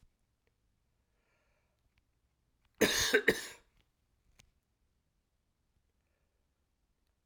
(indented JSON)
{
  "cough_length": "7.3 s",
  "cough_amplitude": 8759,
  "cough_signal_mean_std_ratio": 0.21,
  "survey_phase": "beta (2021-08-13 to 2022-03-07)",
  "age": "45-64",
  "gender": "Male",
  "wearing_mask": "No",
  "symptom_none": true,
  "smoker_status": "Never smoked",
  "respiratory_condition_asthma": false,
  "respiratory_condition_other": false,
  "recruitment_source": "REACT",
  "submission_delay": "1 day",
  "covid_test_result": "Negative",
  "covid_test_method": "RT-qPCR"
}